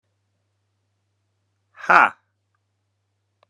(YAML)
exhalation_length: 3.5 s
exhalation_amplitude: 32767
exhalation_signal_mean_std_ratio: 0.18
survey_phase: beta (2021-08-13 to 2022-03-07)
age: 18-44
gender: Male
wearing_mask: 'No'
symptom_cough_any: true
symptom_runny_or_blocked_nose: true
symptom_fatigue: true
symptom_headache: true
symptom_onset: 3 days
smoker_status: Never smoked
respiratory_condition_asthma: false
respiratory_condition_other: false
recruitment_source: Test and Trace
submission_delay: 2 days
covid_test_result: Positive
covid_test_method: RT-qPCR
covid_ct_value: 32.2
covid_ct_gene: ORF1ab gene